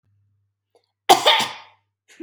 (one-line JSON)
{"cough_length": "2.2 s", "cough_amplitude": 32767, "cough_signal_mean_std_ratio": 0.3, "survey_phase": "beta (2021-08-13 to 2022-03-07)", "age": "18-44", "gender": "Female", "wearing_mask": "No", "symptom_none": true, "smoker_status": "Never smoked", "respiratory_condition_asthma": false, "respiratory_condition_other": false, "recruitment_source": "REACT", "submission_delay": "3 days", "covid_test_result": "Negative", "covid_test_method": "RT-qPCR", "influenza_a_test_result": "Unknown/Void", "influenza_b_test_result": "Unknown/Void"}